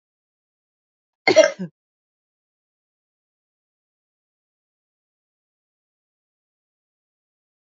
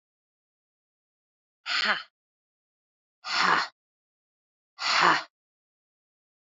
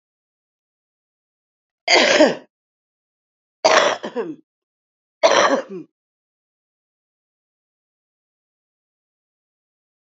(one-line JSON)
{"cough_length": "7.7 s", "cough_amplitude": 28636, "cough_signal_mean_std_ratio": 0.13, "exhalation_length": "6.6 s", "exhalation_amplitude": 16331, "exhalation_signal_mean_std_ratio": 0.31, "three_cough_length": "10.2 s", "three_cough_amplitude": 32767, "three_cough_signal_mean_std_ratio": 0.28, "survey_phase": "alpha (2021-03-01 to 2021-08-12)", "age": "45-64", "gender": "Female", "wearing_mask": "No", "symptom_none": true, "smoker_status": "Ex-smoker", "respiratory_condition_asthma": true, "respiratory_condition_other": false, "recruitment_source": "REACT", "submission_delay": "1 day", "covid_test_result": "Negative", "covid_test_method": "RT-qPCR"}